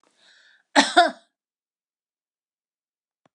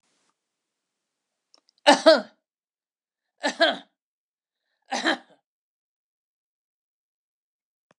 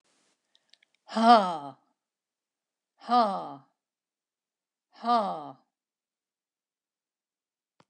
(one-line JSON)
{"cough_length": "3.3 s", "cough_amplitude": 25564, "cough_signal_mean_std_ratio": 0.21, "three_cough_length": "8.0 s", "three_cough_amplitude": 26147, "three_cough_signal_mean_std_ratio": 0.2, "exhalation_length": "7.9 s", "exhalation_amplitude": 17199, "exhalation_signal_mean_std_ratio": 0.26, "survey_phase": "beta (2021-08-13 to 2022-03-07)", "age": "65+", "gender": "Female", "wearing_mask": "No", "symptom_none": true, "smoker_status": "Never smoked", "respiratory_condition_asthma": false, "respiratory_condition_other": false, "recruitment_source": "REACT", "submission_delay": "1 day", "covid_test_result": "Negative", "covid_test_method": "RT-qPCR"}